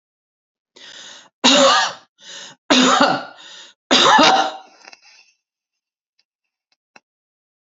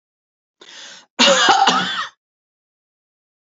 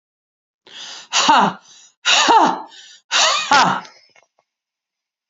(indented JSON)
{
  "three_cough_length": "7.8 s",
  "three_cough_amplitude": 32767,
  "three_cough_signal_mean_std_ratio": 0.39,
  "cough_length": "3.6 s",
  "cough_amplitude": 31979,
  "cough_signal_mean_std_ratio": 0.4,
  "exhalation_length": "5.3 s",
  "exhalation_amplitude": 31063,
  "exhalation_signal_mean_std_ratio": 0.47,
  "survey_phase": "alpha (2021-03-01 to 2021-08-12)",
  "age": "45-64",
  "gender": "Female",
  "wearing_mask": "No",
  "symptom_cough_any": true,
  "symptom_fatigue": true,
  "symptom_headache": true,
  "smoker_status": "Never smoked",
  "respiratory_condition_asthma": false,
  "respiratory_condition_other": false,
  "recruitment_source": "Test and Trace",
  "submission_delay": "1 day",
  "covid_test_result": "Positive",
  "covid_test_method": "RT-qPCR",
  "covid_ct_value": 19.2,
  "covid_ct_gene": "ORF1ab gene",
  "covid_ct_mean": 20.0,
  "covid_viral_load": "280000 copies/ml",
  "covid_viral_load_category": "Low viral load (10K-1M copies/ml)"
}